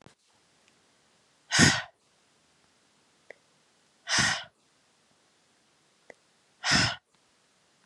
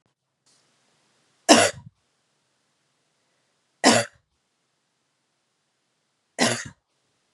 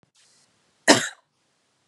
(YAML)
exhalation_length: 7.9 s
exhalation_amplitude: 18726
exhalation_signal_mean_std_ratio: 0.27
three_cough_length: 7.3 s
three_cough_amplitude: 32767
three_cough_signal_mean_std_ratio: 0.21
cough_length: 1.9 s
cough_amplitude: 32365
cough_signal_mean_std_ratio: 0.21
survey_phase: beta (2021-08-13 to 2022-03-07)
age: 45-64
gender: Female
wearing_mask: 'No'
symptom_cough_any: true
symptom_sore_throat: true
symptom_fatigue: true
symptom_onset: 4 days
smoker_status: Never smoked
respiratory_condition_asthma: false
respiratory_condition_other: false
recruitment_source: Test and Trace
submission_delay: 2 days
covid_test_result: Positive
covid_test_method: ePCR